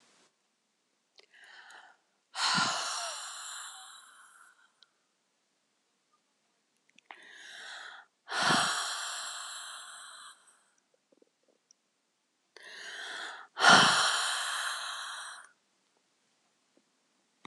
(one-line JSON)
{"exhalation_length": "17.5 s", "exhalation_amplitude": 14288, "exhalation_signal_mean_std_ratio": 0.35, "survey_phase": "beta (2021-08-13 to 2022-03-07)", "age": "65+", "gender": "Female", "wearing_mask": "No", "symptom_cough_any": true, "symptom_runny_or_blocked_nose": true, "symptom_shortness_of_breath": true, "smoker_status": "Never smoked", "respiratory_condition_asthma": true, "respiratory_condition_other": false, "recruitment_source": "REACT", "submission_delay": "3 days", "covid_test_result": "Negative", "covid_test_method": "RT-qPCR"}